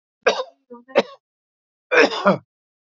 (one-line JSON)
{"three_cough_length": "3.0 s", "three_cough_amplitude": 32767, "three_cough_signal_mean_std_ratio": 0.34, "survey_phase": "beta (2021-08-13 to 2022-03-07)", "age": "45-64", "gender": "Male", "wearing_mask": "No", "symptom_none": true, "smoker_status": "Never smoked", "respiratory_condition_asthma": false, "respiratory_condition_other": false, "recruitment_source": "REACT", "submission_delay": "3 days", "covid_test_result": "Negative", "covid_test_method": "RT-qPCR"}